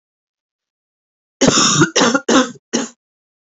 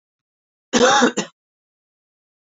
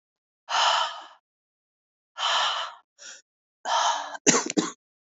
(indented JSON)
{
  "three_cough_length": "3.6 s",
  "three_cough_amplitude": 30002,
  "three_cough_signal_mean_std_ratio": 0.44,
  "cough_length": "2.5 s",
  "cough_amplitude": 23879,
  "cough_signal_mean_std_ratio": 0.34,
  "exhalation_length": "5.1 s",
  "exhalation_amplitude": 20354,
  "exhalation_signal_mean_std_ratio": 0.47,
  "survey_phase": "beta (2021-08-13 to 2022-03-07)",
  "age": "45-64",
  "gender": "Female",
  "wearing_mask": "No",
  "symptom_cough_any": true,
  "symptom_runny_or_blocked_nose": true,
  "symptom_fatigue": true,
  "smoker_status": "Ex-smoker",
  "respiratory_condition_asthma": false,
  "respiratory_condition_other": false,
  "recruitment_source": "Test and Trace",
  "submission_delay": "2 days",
  "covid_test_result": "Positive",
  "covid_test_method": "RT-qPCR",
  "covid_ct_value": 22.4,
  "covid_ct_gene": "ORF1ab gene"
}